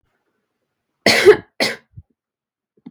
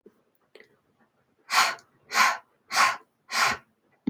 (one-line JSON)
{"cough_length": "2.9 s", "cough_amplitude": 32768, "cough_signal_mean_std_ratio": 0.27, "exhalation_length": "4.1 s", "exhalation_amplitude": 16320, "exhalation_signal_mean_std_ratio": 0.39, "survey_phase": "beta (2021-08-13 to 2022-03-07)", "age": "18-44", "gender": "Female", "wearing_mask": "No", "symptom_none": true, "smoker_status": "Never smoked", "respiratory_condition_asthma": false, "respiratory_condition_other": false, "recruitment_source": "REACT", "submission_delay": "1 day", "covid_test_result": "Negative", "covid_test_method": "RT-qPCR", "influenza_a_test_result": "Unknown/Void", "influenza_b_test_result": "Unknown/Void"}